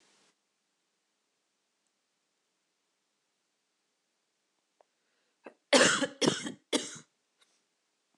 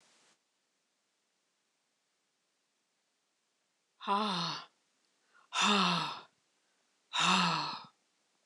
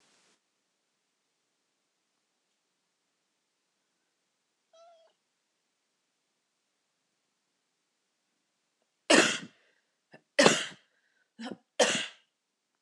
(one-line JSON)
{"cough_length": "8.2 s", "cough_amplitude": 13471, "cough_signal_mean_std_ratio": 0.21, "exhalation_length": "8.5 s", "exhalation_amplitude": 6871, "exhalation_signal_mean_std_ratio": 0.37, "three_cough_length": "12.8 s", "three_cough_amplitude": 23301, "three_cough_signal_mean_std_ratio": 0.18, "survey_phase": "beta (2021-08-13 to 2022-03-07)", "age": "45-64", "gender": "Female", "wearing_mask": "No", "symptom_cough_any": true, "symptom_runny_or_blocked_nose": true, "symptom_sore_throat": true, "symptom_fatigue": true, "symptom_fever_high_temperature": true, "symptom_headache": true, "symptom_change_to_sense_of_smell_or_taste": true, "smoker_status": "Never smoked", "respiratory_condition_asthma": false, "respiratory_condition_other": false, "recruitment_source": "Test and Trace", "submission_delay": "2 days", "covid_test_result": "Positive", "covid_test_method": "LFT"}